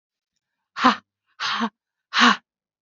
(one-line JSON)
{"exhalation_length": "2.8 s", "exhalation_amplitude": 27174, "exhalation_signal_mean_std_ratio": 0.35, "survey_phase": "beta (2021-08-13 to 2022-03-07)", "age": "18-44", "gender": "Female", "wearing_mask": "No", "symptom_cough_any": true, "symptom_runny_or_blocked_nose": true, "symptom_sore_throat": true, "symptom_fatigue": true, "symptom_headache": true, "symptom_onset": "3 days", "smoker_status": "Ex-smoker", "respiratory_condition_asthma": false, "respiratory_condition_other": false, "recruitment_source": "Test and Trace", "submission_delay": "1 day", "covid_test_result": "Positive", "covid_test_method": "RT-qPCR", "covid_ct_value": 15.3, "covid_ct_gene": "ORF1ab gene", "covid_ct_mean": 15.6, "covid_viral_load": "7800000 copies/ml", "covid_viral_load_category": "High viral load (>1M copies/ml)"}